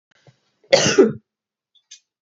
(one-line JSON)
{"cough_length": "2.2 s", "cough_amplitude": 30775, "cough_signal_mean_std_ratio": 0.31, "survey_phase": "beta (2021-08-13 to 2022-03-07)", "age": "45-64", "gender": "Female", "wearing_mask": "No", "symptom_none": true, "symptom_onset": "11 days", "smoker_status": "Never smoked", "respiratory_condition_asthma": false, "respiratory_condition_other": false, "recruitment_source": "REACT", "submission_delay": "3 days", "covid_test_result": "Negative", "covid_test_method": "RT-qPCR", "influenza_a_test_result": "Negative", "influenza_b_test_result": "Negative"}